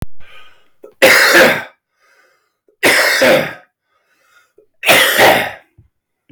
{"three_cough_length": "6.3 s", "three_cough_amplitude": 32768, "three_cough_signal_mean_std_ratio": 0.52, "survey_phase": "beta (2021-08-13 to 2022-03-07)", "age": "65+", "gender": "Male", "wearing_mask": "No", "symptom_cough_any": true, "symptom_runny_or_blocked_nose": true, "symptom_other": true, "symptom_onset": "3 days", "smoker_status": "Ex-smoker", "respiratory_condition_asthma": false, "respiratory_condition_other": false, "recruitment_source": "Test and Trace", "submission_delay": "2 days", "covid_test_result": "Positive", "covid_test_method": "RT-qPCR", "covid_ct_value": 16.9, "covid_ct_gene": "ORF1ab gene"}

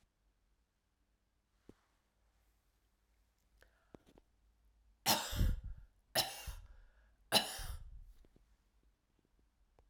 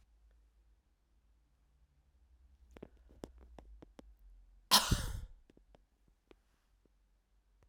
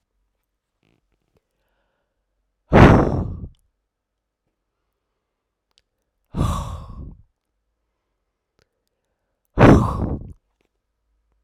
{"three_cough_length": "9.9 s", "three_cough_amplitude": 6053, "three_cough_signal_mean_std_ratio": 0.28, "cough_length": "7.7 s", "cough_amplitude": 9361, "cough_signal_mean_std_ratio": 0.21, "exhalation_length": "11.4 s", "exhalation_amplitude": 32768, "exhalation_signal_mean_std_ratio": 0.25, "survey_phase": "alpha (2021-03-01 to 2021-08-12)", "age": "45-64", "gender": "Female", "wearing_mask": "No", "symptom_new_continuous_cough": true, "symptom_diarrhoea": true, "symptom_fatigue": true, "symptom_headache": true, "symptom_onset": "2 days", "smoker_status": "Never smoked", "respiratory_condition_asthma": false, "respiratory_condition_other": false, "recruitment_source": "Test and Trace", "submission_delay": "2 days", "covid_test_result": "Positive", "covid_test_method": "RT-qPCR", "covid_ct_value": 20.1, "covid_ct_gene": "ORF1ab gene", "covid_ct_mean": 20.8, "covid_viral_load": "150000 copies/ml", "covid_viral_load_category": "Low viral load (10K-1M copies/ml)"}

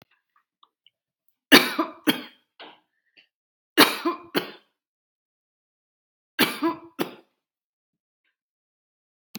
{"three_cough_length": "9.4 s", "three_cough_amplitude": 32718, "three_cough_signal_mean_std_ratio": 0.23, "survey_phase": "beta (2021-08-13 to 2022-03-07)", "age": "45-64", "gender": "Female", "wearing_mask": "No", "symptom_none": true, "smoker_status": "Ex-smoker", "respiratory_condition_asthma": false, "respiratory_condition_other": false, "recruitment_source": "REACT", "submission_delay": "0 days", "covid_test_result": "Negative", "covid_test_method": "RT-qPCR"}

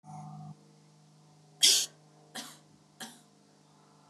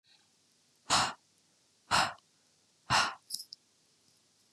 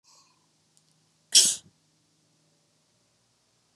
{"three_cough_length": "4.1 s", "three_cough_amplitude": 17545, "three_cough_signal_mean_std_ratio": 0.27, "exhalation_length": "4.5 s", "exhalation_amplitude": 6450, "exhalation_signal_mean_std_ratio": 0.31, "cough_length": "3.8 s", "cough_amplitude": 24821, "cough_signal_mean_std_ratio": 0.18, "survey_phase": "beta (2021-08-13 to 2022-03-07)", "age": "18-44", "gender": "Female", "wearing_mask": "No", "symptom_none": true, "smoker_status": "Never smoked", "respiratory_condition_asthma": false, "respiratory_condition_other": false, "recruitment_source": "REACT", "submission_delay": "0 days", "covid_test_result": "Negative", "covid_test_method": "RT-qPCR", "influenza_a_test_result": "Negative", "influenza_b_test_result": "Negative"}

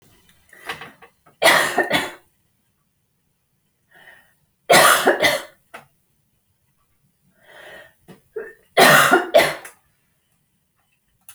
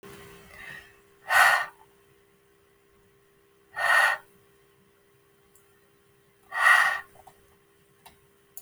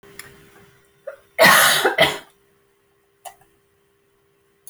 {"three_cough_length": "11.3 s", "three_cough_amplitude": 32768, "three_cough_signal_mean_std_ratio": 0.33, "exhalation_length": "8.6 s", "exhalation_amplitude": 15571, "exhalation_signal_mean_std_ratio": 0.32, "cough_length": "4.7 s", "cough_amplitude": 30938, "cough_signal_mean_std_ratio": 0.32, "survey_phase": "beta (2021-08-13 to 2022-03-07)", "age": "45-64", "gender": "Female", "wearing_mask": "No", "symptom_none": true, "smoker_status": "Ex-smoker", "respiratory_condition_asthma": false, "respiratory_condition_other": false, "recruitment_source": "REACT", "submission_delay": "3 days", "covid_test_result": "Negative", "covid_test_method": "RT-qPCR"}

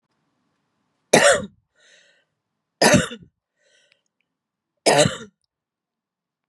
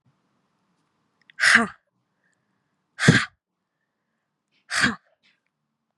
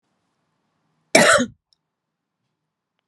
{"three_cough_length": "6.5 s", "three_cough_amplitude": 32767, "three_cough_signal_mean_std_ratio": 0.28, "exhalation_length": "6.0 s", "exhalation_amplitude": 32391, "exhalation_signal_mean_std_ratio": 0.25, "cough_length": "3.1 s", "cough_amplitude": 32768, "cough_signal_mean_std_ratio": 0.25, "survey_phase": "beta (2021-08-13 to 2022-03-07)", "age": "45-64", "gender": "Female", "wearing_mask": "No", "symptom_fatigue": true, "smoker_status": "Never smoked", "respiratory_condition_asthma": false, "respiratory_condition_other": false, "recruitment_source": "REACT", "submission_delay": "1 day", "covid_test_result": "Negative", "covid_test_method": "RT-qPCR", "influenza_a_test_result": "Negative", "influenza_b_test_result": "Negative"}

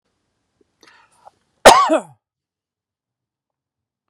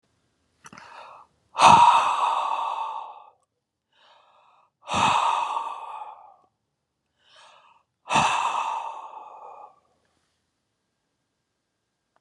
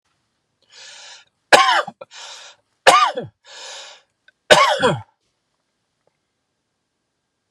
{"cough_length": "4.1 s", "cough_amplitude": 32768, "cough_signal_mean_std_ratio": 0.21, "exhalation_length": "12.2 s", "exhalation_amplitude": 27555, "exhalation_signal_mean_std_ratio": 0.37, "three_cough_length": "7.5 s", "three_cough_amplitude": 32768, "three_cough_signal_mean_std_ratio": 0.3, "survey_phase": "beta (2021-08-13 to 2022-03-07)", "age": "45-64", "gender": "Male", "wearing_mask": "No", "symptom_none": true, "smoker_status": "Never smoked", "respiratory_condition_asthma": true, "respiratory_condition_other": false, "recruitment_source": "REACT", "submission_delay": "1 day", "covid_test_result": "Negative", "covid_test_method": "RT-qPCR"}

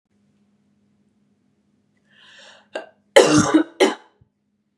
{"cough_length": "4.8 s", "cough_amplitude": 32768, "cough_signal_mean_std_ratio": 0.28, "survey_phase": "beta (2021-08-13 to 2022-03-07)", "age": "18-44", "gender": "Female", "wearing_mask": "No", "symptom_cough_any": true, "symptom_sore_throat": true, "symptom_fatigue": true, "symptom_fever_high_temperature": true, "symptom_headache": true, "smoker_status": "Never smoked", "respiratory_condition_asthma": false, "respiratory_condition_other": false, "recruitment_source": "Test and Trace", "submission_delay": "0 days", "covid_test_result": "Positive", "covid_test_method": "LFT"}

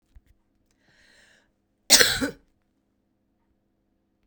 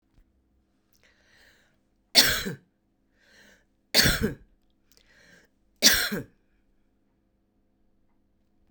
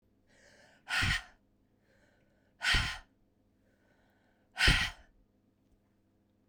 {"cough_length": "4.3 s", "cough_amplitude": 32768, "cough_signal_mean_std_ratio": 0.2, "three_cough_length": "8.7 s", "three_cough_amplitude": 26083, "three_cough_signal_mean_std_ratio": 0.25, "exhalation_length": "6.5 s", "exhalation_amplitude": 8206, "exhalation_signal_mean_std_ratio": 0.31, "survey_phase": "beta (2021-08-13 to 2022-03-07)", "age": "45-64", "gender": "Female", "wearing_mask": "No", "symptom_cough_any": true, "symptom_runny_or_blocked_nose": true, "symptom_fatigue": true, "symptom_fever_high_temperature": true, "symptom_onset": "3 days", "smoker_status": "Current smoker (e-cigarettes or vapes only)", "respiratory_condition_asthma": false, "respiratory_condition_other": false, "recruitment_source": "Test and Trace", "submission_delay": "1 day", "covid_test_result": "Positive", "covid_test_method": "RT-qPCR", "covid_ct_value": 13.5, "covid_ct_gene": "ORF1ab gene", "covid_ct_mean": 13.9, "covid_viral_load": "27000000 copies/ml", "covid_viral_load_category": "High viral load (>1M copies/ml)"}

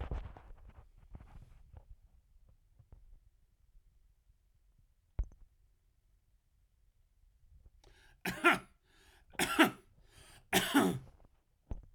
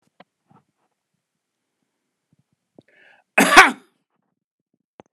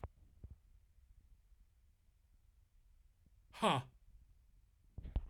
{"three_cough_length": "11.9 s", "three_cough_amplitude": 8912, "three_cough_signal_mean_std_ratio": 0.28, "cough_length": "5.1 s", "cough_amplitude": 32768, "cough_signal_mean_std_ratio": 0.18, "exhalation_length": "5.3 s", "exhalation_amplitude": 2443, "exhalation_signal_mean_std_ratio": 0.28, "survey_phase": "alpha (2021-03-01 to 2021-08-12)", "age": "45-64", "gender": "Male", "wearing_mask": "No", "symptom_none": true, "symptom_onset": "3 days", "smoker_status": "Never smoked", "respiratory_condition_asthma": false, "respiratory_condition_other": false, "recruitment_source": "REACT", "submission_delay": "1 day", "covid_test_result": "Negative", "covid_test_method": "RT-qPCR"}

